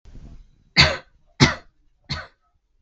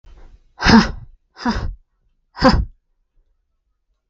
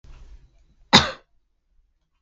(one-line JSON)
{"three_cough_length": "2.8 s", "three_cough_amplitude": 32768, "three_cough_signal_mean_std_ratio": 0.29, "exhalation_length": "4.1 s", "exhalation_amplitude": 32768, "exhalation_signal_mean_std_ratio": 0.33, "cough_length": "2.2 s", "cough_amplitude": 32768, "cough_signal_mean_std_ratio": 0.21, "survey_phase": "beta (2021-08-13 to 2022-03-07)", "age": "18-44", "gender": "Female", "wearing_mask": "No", "symptom_none": true, "smoker_status": "Never smoked", "respiratory_condition_asthma": false, "respiratory_condition_other": false, "recruitment_source": "REACT", "submission_delay": "3 days", "covid_test_result": "Negative", "covid_test_method": "RT-qPCR"}